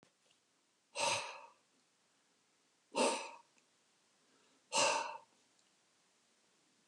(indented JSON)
{
  "exhalation_length": "6.9 s",
  "exhalation_amplitude": 3607,
  "exhalation_signal_mean_std_ratio": 0.32,
  "survey_phase": "beta (2021-08-13 to 2022-03-07)",
  "age": "65+",
  "gender": "Male",
  "wearing_mask": "No",
  "symptom_none": true,
  "smoker_status": "Ex-smoker",
  "respiratory_condition_asthma": false,
  "respiratory_condition_other": false,
  "recruitment_source": "REACT",
  "submission_delay": "1 day",
  "covid_test_result": "Negative",
  "covid_test_method": "RT-qPCR",
  "influenza_a_test_result": "Negative",
  "influenza_b_test_result": "Negative"
}